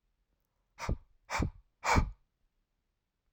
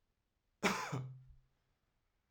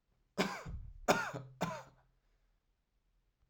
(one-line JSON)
{"exhalation_length": "3.3 s", "exhalation_amplitude": 7625, "exhalation_signal_mean_std_ratio": 0.32, "cough_length": "2.3 s", "cough_amplitude": 3554, "cough_signal_mean_std_ratio": 0.35, "three_cough_length": "3.5 s", "three_cough_amplitude": 6775, "three_cough_signal_mean_std_ratio": 0.37, "survey_phase": "alpha (2021-03-01 to 2021-08-12)", "age": "18-44", "gender": "Male", "wearing_mask": "No", "symptom_none": true, "symptom_onset": "12 days", "smoker_status": "Never smoked", "respiratory_condition_asthma": false, "respiratory_condition_other": false, "recruitment_source": "REACT", "submission_delay": "1 day", "covid_test_result": "Negative", "covid_test_method": "RT-qPCR"}